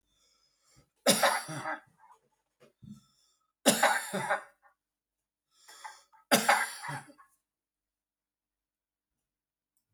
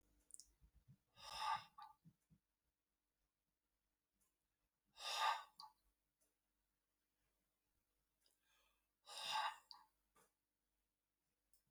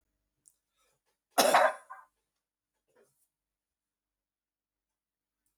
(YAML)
three_cough_length: 9.9 s
three_cough_amplitude: 13588
three_cough_signal_mean_std_ratio: 0.3
exhalation_length: 11.7 s
exhalation_amplitude: 1102
exhalation_signal_mean_std_ratio: 0.27
cough_length: 5.6 s
cough_amplitude: 11866
cough_signal_mean_std_ratio: 0.2
survey_phase: beta (2021-08-13 to 2022-03-07)
age: 65+
gender: Male
wearing_mask: 'No'
symptom_none: true
smoker_status: Never smoked
respiratory_condition_asthma: false
respiratory_condition_other: false
recruitment_source: REACT
submission_delay: 2 days
covid_test_result: Negative
covid_test_method: RT-qPCR